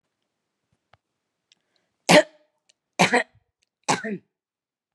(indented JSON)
{
  "three_cough_length": "4.9 s",
  "three_cough_amplitude": 29483,
  "three_cough_signal_mean_std_ratio": 0.23,
  "survey_phase": "beta (2021-08-13 to 2022-03-07)",
  "age": "18-44",
  "gender": "Female",
  "wearing_mask": "No",
  "symptom_cough_any": true,
  "symptom_runny_or_blocked_nose": true,
  "symptom_fatigue": true,
  "symptom_headache": true,
  "symptom_onset": "4 days",
  "smoker_status": "Ex-smoker",
  "respiratory_condition_asthma": false,
  "respiratory_condition_other": false,
  "recruitment_source": "Test and Trace",
  "submission_delay": "2 days",
  "covid_test_result": "Negative",
  "covid_test_method": "ePCR"
}